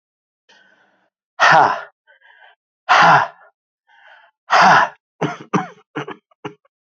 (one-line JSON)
{"exhalation_length": "6.9 s", "exhalation_amplitude": 32767, "exhalation_signal_mean_std_ratio": 0.36, "survey_phase": "beta (2021-08-13 to 2022-03-07)", "age": "45-64", "gender": "Male", "wearing_mask": "No", "symptom_cough_any": true, "symptom_new_continuous_cough": true, "symptom_runny_or_blocked_nose": true, "symptom_sore_throat": true, "symptom_diarrhoea": true, "symptom_headache": true, "symptom_change_to_sense_of_smell_or_taste": true, "symptom_onset": "2 days", "smoker_status": "Never smoked", "respiratory_condition_asthma": false, "respiratory_condition_other": false, "recruitment_source": "Test and Trace", "submission_delay": "1 day", "covid_test_result": "Positive", "covid_test_method": "RT-qPCR", "covid_ct_value": 17.1, "covid_ct_gene": "ORF1ab gene", "covid_ct_mean": 17.4, "covid_viral_load": "2000000 copies/ml", "covid_viral_load_category": "High viral load (>1M copies/ml)"}